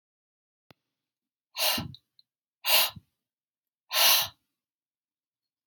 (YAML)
exhalation_length: 5.7 s
exhalation_amplitude: 14147
exhalation_signal_mean_std_ratio: 0.3
survey_phase: beta (2021-08-13 to 2022-03-07)
age: 45-64
gender: Female
wearing_mask: 'No'
symptom_none: true
smoker_status: Ex-smoker
respiratory_condition_asthma: false
respiratory_condition_other: false
recruitment_source: REACT
submission_delay: 4 days
covid_test_result: Negative
covid_test_method: RT-qPCR
influenza_a_test_result: Negative
influenza_b_test_result: Negative